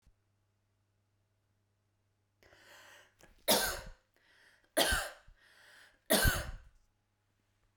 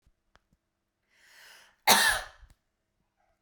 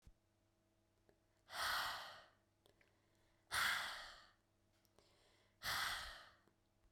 {"three_cough_length": "7.8 s", "three_cough_amplitude": 6612, "three_cough_signal_mean_std_ratio": 0.29, "cough_length": "3.4 s", "cough_amplitude": 21013, "cough_signal_mean_std_ratio": 0.25, "exhalation_length": "6.9 s", "exhalation_amplitude": 1246, "exhalation_signal_mean_std_ratio": 0.42, "survey_phase": "beta (2021-08-13 to 2022-03-07)", "age": "18-44", "gender": "Female", "wearing_mask": "No", "symptom_none": true, "smoker_status": "Ex-smoker", "respiratory_condition_asthma": false, "respiratory_condition_other": false, "recruitment_source": "REACT", "submission_delay": "2 days", "covid_test_result": "Negative", "covid_test_method": "RT-qPCR"}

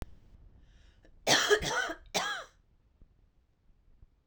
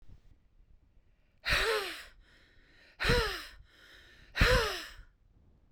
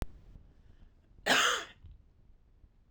{"three_cough_length": "4.3 s", "three_cough_amplitude": 8928, "three_cough_signal_mean_std_ratio": 0.37, "exhalation_length": "5.7 s", "exhalation_amplitude": 9716, "exhalation_signal_mean_std_ratio": 0.41, "cough_length": "2.9 s", "cough_amplitude": 8216, "cough_signal_mean_std_ratio": 0.36, "survey_phase": "beta (2021-08-13 to 2022-03-07)", "age": "45-64", "gender": "Female", "wearing_mask": "No", "symptom_none": true, "smoker_status": "Ex-smoker", "respiratory_condition_asthma": true, "respiratory_condition_other": false, "recruitment_source": "REACT", "submission_delay": "2 days", "covid_test_result": "Negative", "covid_test_method": "RT-qPCR", "influenza_a_test_result": "Unknown/Void", "influenza_b_test_result": "Unknown/Void"}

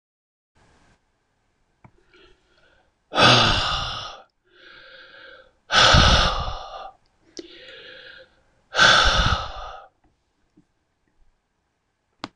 {"exhalation_length": "12.4 s", "exhalation_amplitude": 25692, "exhalation_signal_mean_std_ratio": 0.36, "survey_phase": "beta (2021-08-13 to 2022-03-07)", "age": "65+", "gender": "Male", "wearing_mask": "No", "symptom_none": true, "smoker_status": "Ex-smoker", "respiratory_condition_asthma": false, "respiratory_condition_other": false, "recruitment_source": "REACT", "submission_delay": "0 days", "covid_test_result": "Negative", "covid_test_method": "RT-qPCR", "influenza_a_test_result": "Negative", "influenza_b_test_result": "Negative"}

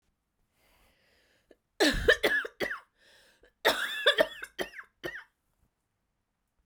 {"three_cough_length": "6.7 s", "three_cough_amplitude": 12045, "three_cough_signal_mean_std_ratio": 0.34, "survey_phase": "beta (2021-08-13 to 2022-03-07)", "age": "45-64", "gender": "Female", "wearing_mask": "No", "symptom_cough_any": true, "symptom_runny_or_blocked_nose": true, "symptom_sore_throat": true, "symptom_fatigue": true, "symptom_fever_high_temperature": true, "symptom_headache": true, "symptom_change_to_sense_of_smell_or_taste": true, "symptom_loss_of_taste": true, "symptom_other": true, "symptom_onset": "2 days", "smoker_status": "Never smoked", "respiratory_condition_asthma": false, "respiratory_condition_other": false, "recruitment_source": "Test and Trace", "submission_delay": "2 days", "covid_test_method": "RT-qPCR", "covid_ct_value": 26.7, "covid_ct_gene": "ORF1ab gene"}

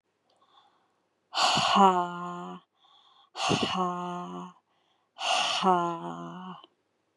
{"exhalation_length": "7.2 s", "exhalation_amplitude": 13903, "exhalation_signal_mean_std_ratio": 0.5, "survey_phase": "beta (2021-08-13 to 2022-03-07)", "age": "18-44", "gender": "Female", "wearing_mask": "No", "symptom_none": true, "smoker_status": "Ex-smoker", "respiratory_condition_asthma": false, "respiratory_condition_other": false, "recruitment_source": "REACT", "submission_delay": "14 days", "covid_test_result": "Negative", "covid_test_method": "RT-qPCR"}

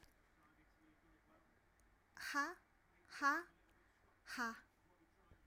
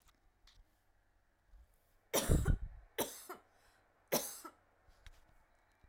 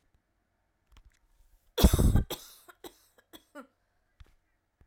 {"exhalation_length": "5.5 s", "exhalation_amplitude": 1877, "exhalation_signal_mean_std_ratio": 0.33, "three_cough_length": "5.9 s", "three_cough_amplitude": 5169, "three_cough_signal_mean_std_ratio": 0.31, "cough_length": "4.9 s", "cough_amplitude": 15956, "cough_signal_mean_std_ratio": 0.25, "survey_phase": "alpha (2021-03-01 to 2021-08-12)", "age": "18-44", "gender": "Female", "wearing_mask": "No", "symptom_none": true, "smoker_status": "Never smoked", "respiratory_condition_asthma": true, "respiratory_condition_other": false, "recruitment_source": "REACT", "submission_delay": "1 day", "covid_test_result": "Negative", "covid_test_method": "RT-qPCR"}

